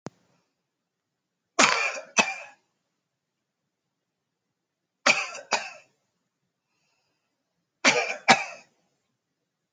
{"three_cough_length": "9.7 s", "three_cough_amplitude": 27636, "three_cough_signal_mean_std_ratio": 0.26, "survey_phase": "alpha (2021-03-01 to 2021-08-12)", "age": "18-44", "gender": "Male", "wearing_mask": "No", "symptom_none": true, "smoker_status": "Never smoked", "respiratory_condition_asthma": false, "respiratory_condition_other": false, "recruitment_source": "REACT", "submission_delay": "2 days", "covid_test_result": "Negative", "covid_test_method": "RT-qPCR"}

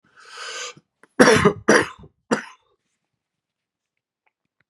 {"cough_length": "4.7 s", "cough_amplitude": 32768, "cough_signal_mean_std_ratio": 0.29, "survey_phase": "beta (2021-08-13 to 2022-03-07)", "age": "45-64", "gender": "Male", "wearing_mask": "No", "symptom_cough_any": true, "symptom_new_continuous_cough": true, "symptom_fatigue": true, "symptom_fever_high_temperature": true, "symptom_headache": true, "symptom_onset": "3 days", "smoker_status": "Never smoked", "respiratory_condition_asthma": false, "respiratory_condition_other": false, "recruitment_source": "Test and Trace", "submission_delay": "2 days", "covid_test_result": "Positive", "covid_test_method": "RT-qPCR", "covid_ct_value": 10.7, "covid_ct_gene": "ORF1ab gene"}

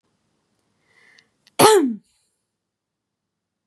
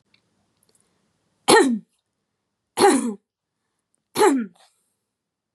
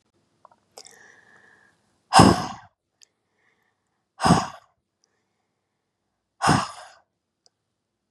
{"cough_length": "3.7 s", "cough_amplitude": 32672, "cough_signal_mean_std_ratio": 0.24, "three_cough_length": "5.5 s", "three_cough_amplitude": 29884, "three_cough_signal_mean_std_ratio": 0.32, "exhalation_length": "8.1 s", "exhalation_amplitude": 32665, "exhalation_signal_mean_std_ratio": 0.23, "survey_phase": "beta (2021-08-13 to 2022-03-07)", "age": "18-44", "gender": "Female", "wearing_mask": "No", "symptom_cough_any": true, "symptom_fatigue": true, "smoker_status": "Never smoked", "respiratory_condition_asthma": false, "respiratory_condition_other": false, "recruitment_source": "REACT", "submission_delay": "2 days", "covid_test_result": "Negative", "covid_test_method": "RT-qPCR", "influenza_a_test_result": "Negative", "influenza_b_test_result": "Negative"}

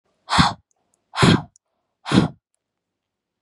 {"exhalation_length": "3.4 s", "exhalation_amplitude": 29820, "exhalation_signal_mean_std_ratio": 0.33, "survey_phase": "beta (2021-08-13 to 2022-03-07)", "age": "18-44", "gender": "Female", "wearing_mask": "No", "symptom_cough_any": true, "symptom_onset": "8 days", "smoker_status": "Never smoked", "respiratory_condition_asthma": false, "respiratory_condition_other": false, "recruitment_source": "REACT", "submission_delay": "2 days", "covid_test_result": "Negative", "covid_test_method": "RT-qPCR", "influenza_a_test_result": "Unknown/Void", "influenza_b_test_result": "Unknown/Void"}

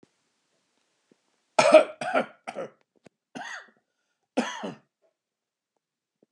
{"cough_length": "6.3 s", "cough_amplitude": 26581, "cough_signal_mean_std_ratio": 0.23, "survey_phase": "beta (2021-08-13 to 2022-03-07)", "age": "45-64", "gender": "Male", "wearing_mask": "No", "symptom_sore_throat": true, "smoker_status": "Never smoked", "respiratory_condition_asthma": false, "respiratory_condition_other": true, "recruitment_source": "REACT", "submission_delay": "2 days", "covid_test_result": "Negative", "covid_test_method": "RT-qPCR", "influenza_a_test_result": "Negative", "influenza_b_test_result": "Negative"}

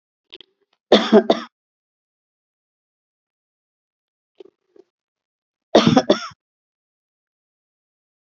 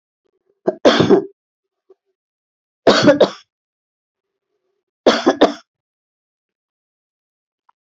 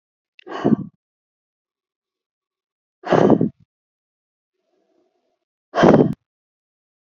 {"cough_length": "8.4 s", "cough_amplitude": 27906, "cough_signal_mean_std_ratio": 0.21, "three_cough_length": "7.9 s", "three_cough_amplitude": 31633, "three_cough_signal_mean_std_ratio": 0.29, "exhalation_length": "7.1 s", "exhalation_amplitude": 29402, "exhalation_signal_mean_std_ratio": 0.27, "survey_phase": "alpha (2021-03-01 to 2021-08-12)", "age": "65+", "gender": "Female", "wearing_mask": "No", "symptom_none": true, "smoker_status": "Never smoked", "respiratory_condition_asthma": false, "respiratory_condition_other": false, "recruitment_source": "REACT", "submission_delay": "1 day", "covid_test_result": "Negative", "covid_test_method": "RT-qPCR"}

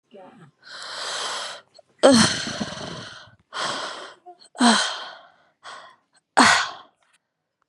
{"exhalation_length": "7.7 s", "exhalation_amplitude": 31853, "exhalation_signal_mean_std_ratio": 0.4, "survey_phase": "beta (2021-08-13 to 2022-03-07)", "age": "18-44", "gender": "Female", "wearing_mask": "No", "symptom_cough_any": true, "symptom_runny_or_blocked_nose": true, "symptom_sore_throat": true, "symptom_fever_high_temperature": true, "symptom_headache": true, "smoker_status": "Never smoked", "respiratory_condition_asthma": false, "respiratory_condition_other": false, "recruitment_source": "Test and Trace", "submission_delay": "29 days", "covid_test_result": "Negative", "covid_test_method": "RT-qPCR"}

